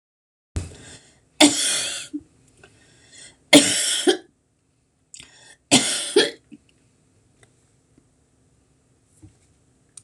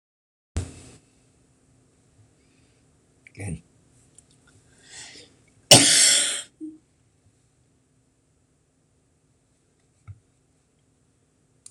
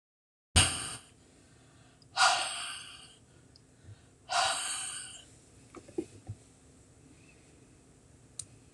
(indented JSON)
{
  "three_cough_length": "10.0 s",
  "three_cough_amplitude": 26028,
  "three_cough_signal_mean_std_ratio": 0.3,
  "cough_length": "11.7 s",
  "cough_amplitude": 26028,
  "cough_signal_mean_std_ratio": 0.21,
  "exhalation_length": "8.7 s",
  "exhalation_amplitude": 13261,
  "exhalation_signal_mean_std_ratio": 0.36,
  "survey_phase": "beta (2021-08-13 to 2022-03-07)",
  "age": "65+",
  "gender": "Female",
  "wearing_mask": "No",
  "symptom_none": true,
  "smoker_status": "Never smoked",
  "respiratory_condition_asthma": false,
  "respiratory_condition_other": false,
  "recruitment_source": "REACT",
  "submission_delay": "2 days",
  "covid_test_result": "Negative",
  "covid_test_method": "RT-qPCR",
  "influenza_a_test_result": "Negative",
  "influenza_b_test_result": "Negative"
}